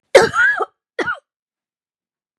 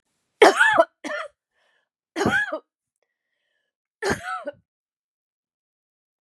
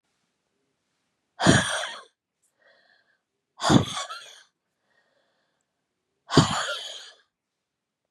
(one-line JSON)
{"cough_length": "2.4 s", "cough_amplitude": 32768, "cough_signal_mean_std_ratio": 0.37, "three_cough_length": "6.2 s", "three_cough_amplitude": 30851, "three_cough_signal_mean_std_ratio": 0.3, "exhalation_length": "8.1 s", "exhalation_amplitude": 26761, "exhalation_signal_mean_std_ratio": 0.28, "survey_phase": "beta (2021-08-13 to 2022-03-07)", "age": "65+", "gender": "Female", "wearing_mask": "No", "symptom_runny_or_blocked_nose": true, "smoker_status": "Ex-smoker", "respiratory_condition_asthma": false, "respiratory_condition_other": false, "recruitment_source": "REACT", "submission_delay": "1 day", "covid_test_result": "Negative", "covid_test_method": "RT-qPCR", "influenza_a_test_result": "Negative", "influenza_b_test_result": "Negative"}